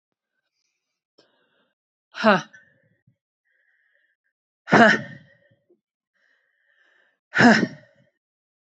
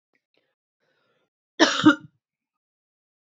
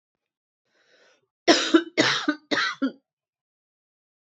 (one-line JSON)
{"exhalation_length": "8.8 s", "exhalation_amplitude": 27306, "exhalation_signal_mean_std_ratio": 0.23, "cough_length": "3.3 s", "cough_amplitude": 24846, "cough_signal_mean_std_ratio": 0.21, "three_cough_length": "4.3 s", "three_cough_amplitude": 25479, "three_cough_signal_mean_std_ratio": 0.34, "survey_phase": "beta (2021-08-13 to 2022-03-07)", "age": "45-64", "gender": "Female", "wearing_mask": "No", "symptom_cough_any": true, "symptom_runny_or_blocked_nose": true, "symptom_fatigue": true, "symptom_headache": true, "symptom_change_to_sense_of_smell_or_taste": true, "symptom_onset": "3 days", "smoker_status": "Ex-smoker", "respiratory_condition_asthma": false, "respiratory_condition_other": false, "recruitment_source": "Test and Trace", "submission_delay": "2 days", "covid_test_result": "Positive", "covid_test_method": "RT-qPCR", "covid_ct_value": 26.4, "covid_ct_gene": "ORF1ab gene"}